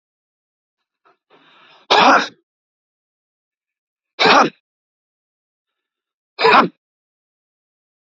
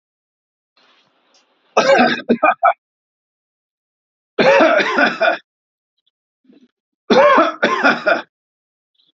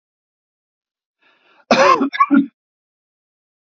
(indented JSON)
{
  "exhalation_length": "8.1 s",
  "exhalation_amplitude": 30127,
  "exhalation_signal_mean_std_ratio": 0.27,
  "three_cough_length": "9.1 s",
  "three_cough_amplitude": 30655,
  "three_cough_signal_mean_std_ratio": 0.43,
  "cough_length": "3.8 s",
  "cough_amplitude": 31968,
  "cough_signal_mean_std_ratio": 0.32,
  "survey_phase": "alpha (2021-03-01 to 2021-08-12)",
  "age": "45-64",
  "gender": "Male",
  "wearing_mask": "No",
  "symptom_none": true,
  "smoker_status": "Never smoked",
  "respiratory_condition_asthma": false,
  "respiratory_condition_other": false,
  "recruitment_source": "REACT",
  "submission_delay": "1 day",
  "covid_test_result": "Negative",
  "covid_test_method": "RT-qPCR"
}